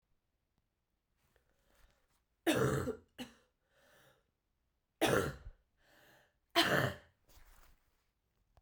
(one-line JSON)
{"three_cough_length": "8.6 s", "three_cough_amplitude": 5178, "three_cough_signal_mean_std_ratio": 0.3, "survey_phase": "beta (2021-08-13 to 2022-03-07)", "age": "18-44", "gender": "Female", "wearing_mask": "No", "symptom_cough_any": true, "symptom_new_continuous_cough": true, "symptom_runny_or_blocked_nose": true, "symptom_sore_throat": true, "symptom_fatigue": true, "symptom_fever_high_temperature": true, "symptom_headache": true, "symptom_change_to_sense_of_smell_or_taste": true, "symptom_loss_of_taste": true, "symptom_onset": "5 days", "smoker_status": "Never smoked", "respiratory_condition_asthma": false, "respiratory_condition_other": false, "recruitment_source": "Test and Trace", "submission_delay": "1 day", "covid_test_result": "Positive", "covid_test_method": "RT-qPCR", "covid_ct_value": 15.0, "covid_ct_gene": "ORF1ab gene", "covid_ct_mean": 15.2, "covid_viral_load": "10000000 copies/ml", "covid_viral_load_category": "High viral load (>1M copies/ml)"}